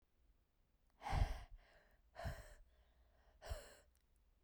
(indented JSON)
{
  "exhalation_length": "4.4 s",
  "exhalation_amplitude": 1822,
  "exhalation_signal_mean_std_ratio": 0.34,
  "survey_phase": "beta (2021-08-13 to 2022-03-07)",
  "age": "18-44",
  "gender": "Female",
  "wearing_mask": "No",
  "symptom_none": true,
  "smoker_status": "Never smoked",
  "respiratory_condition_asthma": false,
  "respiratory_condition_other": false,
  "recruitment_source": "REACT",
  "submission_delay": "1 day",
  "covid_test_result": "Negative",
  "covid_test_method": "RT-qPCR"
}